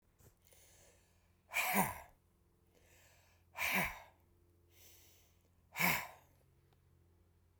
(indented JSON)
{
  "exhalation_length": "7.6 s",
  "exhalation_amplitude": 3704,
  "exhalation_signal_mean_std_ratio": 0.33,
  "survey_phase": "beta (2021-08-13 to 2022-03-07)",
  "age": "65+",
  "gender": "Male",
  "wearing_mask": "No",
  "symptom_none": true,
  "smoker_status": "Ex-smoker",
  "respiratory_condition_asthma": false,
  "respiratory_condition_other": false,
  "recruitment_source": "REACT",
  "submission_delay": "1 day",
  "covid_test_result": "Negative",
  "covid_test_method": "RT-qPCR"
}